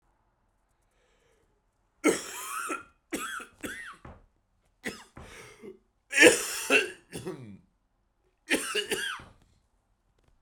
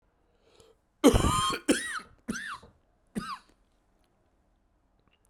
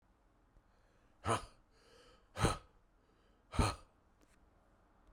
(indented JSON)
{
  "three_cough_length": "10.4 s",
  "three_cough_amplitude": 23822,
  "three_cough_signal_mean_std_ratio": 0.31,
  "cough_length": "5.3 s",
  "cough_amplitude": 15676,
  "cough_signal_mean_std_ratio": 0.32,
  "exhalation_length": "5.1 s",
  "exhalation_amplitude": 4342,
  "exhalation_signal_mean_std_ratio": 0.28,
  "survey_phase": "beta (2021-08-13 to 2022-03-07)",
  "age": "45-64",
  "gender": "Male",
  "wearing_mask": "No",
  "symptom_cough_any": true,
  "symptom_sore_throat": true,
  "symptom_fatigue": true,
  "symptom_headache": true,
  "symptom_onset": "4 days",
  "smoker_status": "Never smoked",
  "respiratory_condition_asthma": true,
  "respiratory_condition_other": false,
  "recruitment_source": "Test and Trace",
  "submission_delay": "2 days",
  "covid_test_result": "Positive",
  "covid_test_method": "LAMP"
}